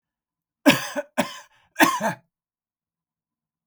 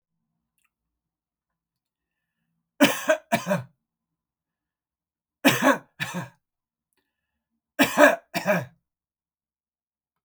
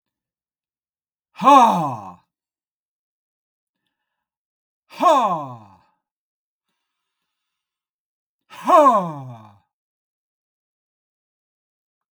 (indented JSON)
{
  "cough_length": "3.7 s",
  "cough_amplitude": 31603,
  "cough_signal_mean_std_ratio": 0.29,
  "three_cough_length": "10.2 s",
  "three_cough_amplitude": 28404,
  "three_cough_signal_mean_std_ratio": 0.27,
  "exhalation_length": "12.1 s",
  "exhalation_amplitude": 31673,
  "exhalation_signal_mean_std_ratio": 0.26,
  "survey_phase": "beta (2021-08-13 to 2022-03-07)",
  "age": "65+",
  "gender": "Male",
  "wearing_mask": "No",
  "symptom_none": true,
  "smoker_status": "Ex-smoker",
  "respiratory_condition_asthma": false,
  "respiratory_condition_other": false,
  "recruitment_source": "REACT",
  "submission_delay": "1 day",
  "covid_test_result": "Negative",
  "covid_test_method": "RT-qPCR",
  "influenza_a_test_result": "Negative",
  "influenza_b_test_result": "Negative"
}